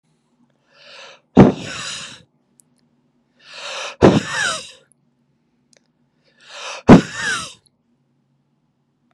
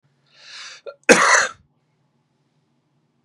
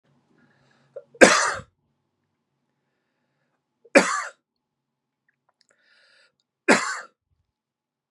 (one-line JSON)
{"exhalation_length": "9.1 s", "exhalation_amplitude": 32768, "exhalation_signal_mean_std_ratio": 0.26, "cough_length": "3.2 s", "cough_amplitude": 32768, "cough_signal_mean_std_ratio": 0.28, "three_cough_length": "8.1 s", "three_cough_amplitude": 32768, "three_cough_signal_mean_std_ratio": 0.21, "survey_phase": "beta (2021-08-13 to 2022-03-07)", "age": "45-64", "gender": "Male", "wearing_mask": "No", "symptom_abdominal_pain": true, "symptom_fatigue": true, "symptom_other": true, "smoker_status": "Never smoked", "respiratory_condition_asthma": false, "respiratory_condition_other": false, "recruitment_source": "Test and Trace", "submission_delay": "1 day", "covid_test_result": "Positive", "covid_test_method": "LFT"}